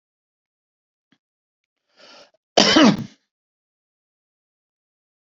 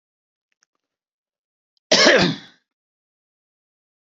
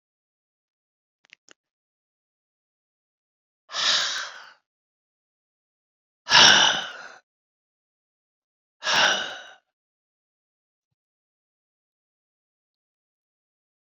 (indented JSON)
{
  "cough_length": "5.4 s",
  "cough_amplitude": 30001,
  "cough_signal_mean_std_ratio": 0.22,
  "three_cough_length": "4.1 s",
  "three_cough_amplitude": 29332,
  "three_cough_signal_mean_std_ratio": 0.26,
  "exhalation_length": "13.8 s",
  "exhalation_amplitude": 27106,
  "exhalation_signal_mean_std_ratio": 0.23,
  "survey_phase": "beta (2021-08-13 to 2022-03-07)",
  "age": "65+",
  "gender": "Male",
  "wearing_mask": "No",
  "symptom_none": true,
  "smoker_status": "Ex-smoker",
  "respiratory_condition_asthma": false,
  "respiratory_condition_other": false,
  "recruitment_source": "REACT",
  "submission_delay": "1 day",
  "covid_test_result": "Negative",
  "covid_test_method": "RT-qPCR"
}